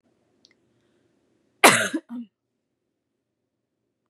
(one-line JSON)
{"cough_length": "4.1 s", "cough_amplitude": 32767, "cough_signal_mean_std_ratio": 0.19, "survey_phase": "beta (2021-08-13 to 2022-03-07)", "age": "18-44", "gender": "Female", "wearing_mask": "No", "symptom_cough_any": true, "symptom_runny_or_blocked_nose": true, "smoker_status": "Never smoked", "respiratory_condition_asthma": false, "respiratory_condition_other": false, "recruitment_source": "Test and Trace", "submission_delay": "2 days", "covid_test_result": "Positive", "covid_test_method": "LFT"}